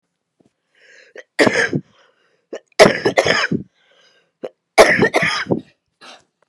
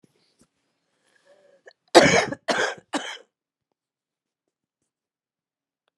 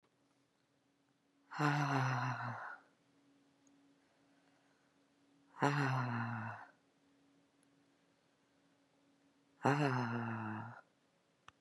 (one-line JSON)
{"three_cough_length": "6.5 s", "three_cough_amplitude": 32768, "three_cough_signal_mean_std_ratio": 0.38, "cough_length": "6.0 s", "cough_amplitude": 32398, "cough_signal_mean_std_ratio": 0.23, "exhalation_length": "11.6 s", "exhalation_amplitude": 4855, "exhalation_signal_mean_std_ratio": 0.41, "survey_phase": "beta (2021-08-13 to 2022-03-07)", "age": "45-64", "gender": "Female", "wearing_mask": "No", "symptom_none": true, "symptom_onset": "13 days", "smoker_status": "Current smoker (11 or more cigarettes per day)", "respiratory_condition_asthma": true, "respiratory_condition_other": true, "recruitment_source": "REACT", "submission_delay": "7 days", "covid_test_result": "Negative", "covid_test_method": "RT-qPCR", "influenza_a_test_result": "Negative", "influenza_b_test_result": "Negative"}